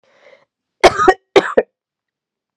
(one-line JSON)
{"cough_length": "2.6 s", "cough_amplitude": 32768, "cough_signal_mean_std_ratio": 0.3, "survey_phase": "beta (2021-08-13 to 2022-03-07)", "age": "18-44", "gender": "Female", "wearing_mask": "No", "symptom_cough_any": true, "symptom_runny_or_blocked_nose": true, "symptom_fatigue": true, "symptom_fever_high_temperature": true, "symptom_headache": true, "smoker_status": "Never smoked", "respiratory_condition_asthma": false, "respiratory_condition_other": false, "recruitment_source": "Test and Trace", "submission_delay": "2 days", "covid_test_result": "Positive", "covid_test_method": "RT-qPCR", "covid_ct_value": 19.3, "covid_ct_gene": "ORF1ab gene", "covid_ct_mean": 19.7, "covid_viral_load": "360000 copies/ml", "covid_viral_load_category": "Low viral load (10K-1M copies/ml)"}